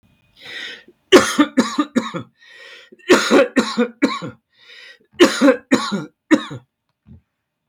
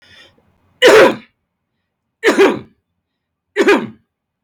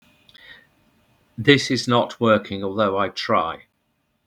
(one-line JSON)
{"cough_length": "7.7 s", "cough_amplitude": 32768, "cough_signal_mean_std_ratio": 0.41, "three_cough_length": "4.4 s", "three_cough_amplitude": 32768, "three_cough_signal_mean_std_ratio": 0.38, "exhalation_length": "4.3 s", "exhalation_amplitude": 32768, "exhalation_signal_mean_std_ratio": 0.48, "survey_phase": "beta (2021-08-13 to 2022-03-07)", "age": "45-64", "gender": "Male", "wearing_mask": "No", "symptom_none": true, "smoker_status": "Never smoked", "respiratory_condition_asthma": false, "respiratory_condition_other": false, "recruitment_source": "REACT", "submission_delay": "2 days", "covid_test_result": "Negative", "covid_test_method": "RT-qPCR"}